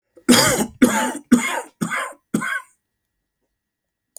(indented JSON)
{
  "three_cough_length": "4.2 s",
  "three_cough_amplitude": 31159,
  "three_cough_signal_mean_std_ratio": 0.44,
  "survey_phase": "beta (2021-08-13 to 2022-03-07)",
  "age": "45-64",
  "gender": "Male",
  "wearing_mask": "No",
  "symptom_none": true,
  "smoker_status": "Never smoked",
  "respiratory_condition_asthma": false,
  "respiratory_condition_other": false,
  "recruitment_source": "REACT",
  "submission_delay": "1 day",
  "covid_test_result": "Negative",
  "covid_test_method": "RT-qPCR"
}